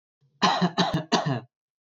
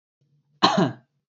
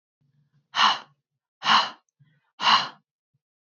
{"three_cough_length": "2.0 s", "three_cough_amplitude": 13744, "three_cough_signal_mean_std_ratio": 0.53, "cough_length": "1.3 s", "cough_amplitude": 24853, "cough_signal_mean_std_ratio": 0.37, "exhalation_length": "3.8 s", "exhalation_amplitude": 17507, "exhalation_signal_mean_std_ratio": 0.34, "survey_phase": "beta (2021-08-13 to 2022-03-07)", "age": "18-44", "gender": "Male", "wearing_mask": "No", "symptom_none": true, "smoker_status": "Never smoked", "respiratory_condition_asthma": false, "respiratory_condition_other": false, "recruitment_source": "REACT", "submission_delay": "2 days", "covid_test_result": "Negative", "covid_test_method": "RT-qPCR", "influenza_a_test_result": "Negative", "influenza_b_test_result": "Negative"}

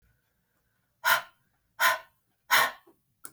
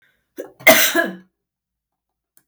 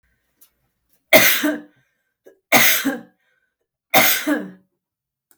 {"exhalation_length": "3.3 s", "exhalation_amplitude": 13455, "exhalation_signal_mean_std_ratio": 0.32, "cough_length": "2.5 s", "cough_amplitude": 32768, "cough_signal_mean_std_ratio": 0.31, "three_cough_length": "5.4 s", "three_cough_amplitude": 32768, "three_cough_signal_mean_std_ratio": 0.38, "survey_phase": "beta (2021-08-13 to 2022-03-07)", "age": "65+", "gender": "Female", "wearing_mask": "No", "symptom_none": true, "smoker_status": "Ex-smoker", "respiratory_condition_asthma": false, "respiratory_condition_other": false, "recruitment_source": "REACT", "submission_delay": "1 day", "covid_test_result": "Negative", "covid_test_method": "RT-qPCR", "influenza_a_test_result": "Negative", "influenza_b_test_result": "Negative"}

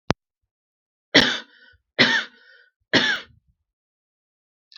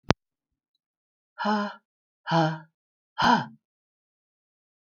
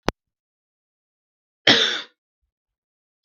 {"three_cough_length": "4.8 s", "three_cough_amplitude": 32768, "three_cough_signal_mean_std_ratio": 0.29, "exhalation_length": "4.9 s", "exhalation_amplitude": 32768, "exhalation_signal_mean_std_ratio": 0.32, "cough_length": "3.2 s", "cough_amplitude": 32768, "cough_signal_mean_std_ratio": 0.23, "survey_phase": "beta (2021-08-13 to 2022-03-07)", "age": "45-64", "gender": "Female", "wearing_mask": "No", "symptom_cough_any": true, "symptom_runny_or_blocked_nose": true, "symptom_sore_throat": true, "symptom_fatigue": true, "symptom_headache": true, "symptom_onset": "3 days", "smoker_status": "Never smoked", "respiratory_condition_asthma": false, "respiratory_condition_other": false, "recruitment_source": "Test and Trace", "submission_delay": "2 days", "covid_test_result": "Positive", "covid_test_method": "RT-qPCR", "covid_ct_value": 18.1, "covid_ct_gene": "ORF1ab gene", "covid_ct_mean": 18.4, "covid_viral_load": "920000 copies/ml", "covid_viral_load_category": "Low viral load (10K-1M copies/ml)"}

